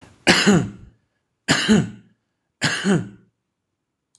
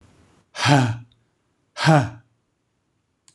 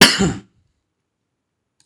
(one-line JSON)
{"three_cough_length": "4.2 s", "three_cough_amplitude": 26027, "three_cough_signal_mean_std_ratio": 0.43, "exhalation_length": "3.3 s", "exhalation_amplitude": 26023, "exhalation_signal_mean_std_ratio": 0.35, "cough_length": "1.9 s", "cough_amplitude": 26028, "cough_signal_mean_std_ratio": 0.29, "survey_phase": "beta (2021-08-13 to 2022-03-07)", "age": "65+", "gender": "Male", "wearing_mask": "No", "symptom_none": true, "symptom_onset": "12 days", "smoker_status": "Never smoked", "respiratory_condition_asthma": false, "respiratory_condition_other": true, "recruitment_source": "REACT", "submission_delay": "3 days", "covid_test_result": "Negative", "covid_test_method": "RT-qPCR"}